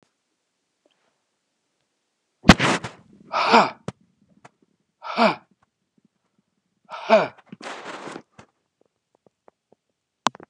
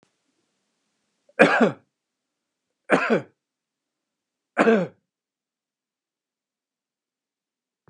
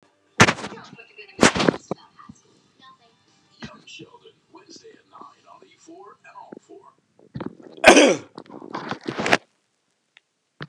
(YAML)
exhalation_length: 10.5 s
exhalation_amplitude: 29204
exhalation_signal_mean_std_ratio: 0.24
three_cough_length: 7.9 s
three_cough_amplitude: 29204
three_cough_signal_mean_std_ratio: 0.25
cough_length: 10.7 s
cough_amplitude: 29204
cough_signal_mean_std_ratio: 0.25
survey_phase: beta (2021-08-13 to 2022-03-07)
age: 45-64
gender: Male
wearing_mask: 'No'
symptom_none: true
smoker_status: Ex-smoker
respiratory_condition_asthma: false
respiratory_condition_other: false
recruitment_source: REACT
submission_delay: 3 days
covid_test_result: Negative
covid_test_method: RT-qPCR